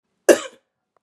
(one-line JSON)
{"cough_length": "1.0 s", "cough_amplitude": 32565, "cough_signal_mean_std_ratio": 0.22, "survey_phase": "beta (2021-08-13 to 2022-03-07)", "age": "18-44", "gender": "Female", "wearing_mask": "No", "symptom_cough_any": true, "symptom_runny_or_blocked_nose": true, "symptom_onset": "8 days", "smoker_status": "Never smoked", "respiratory_condition_asthma": false, "respiratory_condition_other": false, "recruitment_source": "Test and Trace", "submission_delay": "2 days", "covid_test_result": "Positive", "covid_test_method": "RT-qPCR", "covid_ct_value": 14.0, "covid_ct_gene": "ORF1ab gene"}